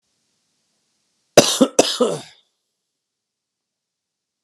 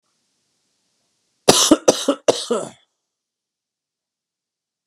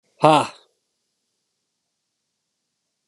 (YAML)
cough_length: 4.4 s
cough_amplitude: 32768
cough_signal_mean_std_ratio: 0.24
three_cough_length: 4.9 s
three_cough_amplitude: 32768
three_cough_signal_mean_std_ratio: 0.26
exhalation_length: 3.1 s
exhalation_amplitude: 32748
exhalation_signal_mean_std_ratio: 0.2
survey_phase: alpha (2021-03-01 to 2021-08-12)
age: 18-44
gender: Male
wearing_mask: 'No'
symptom_cough_any: true
symptom_shortness_of_breath: true
symptom_fatigue: true
symptom_fever_high_temperature: true
symptom_headache: true
symptom_change_to_sense_of_smell_or_taste: true
symptom_onset: 3 days
smoker_status: Ex-smoker
respiratory_condition_asthma: false
respiratory_condition_other: false
recruitment_source: Test and Trace
submission_delay: 2 days
covid_test_result: Positive
covid_test_method: RT-qPCR